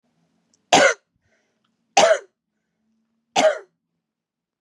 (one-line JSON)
{"three_cough_length": "4.6 s", "three_cough_amplitude": 31155, "three_cough_signal_mean_std_ratio": 0.29, "survey_phase": "beta (2021-08-13 to 2022-03-07)", "age": "18-44", "gender": "Female", "wearing_mask": "No", "symptom_runny_or_blocked_nose": true, "smoker_status": "Never smoked", "respiratory_condition_asthma": false, "respiratory_condition_other": false, "recruitment_source": "REACT", "submission_delay": "1 day", "covid_test_result": "Negative", "covid_test_method": "RT-qPCR", "influenza_a_test_result": "Negative", "influenza_b_test_result": "Negative"}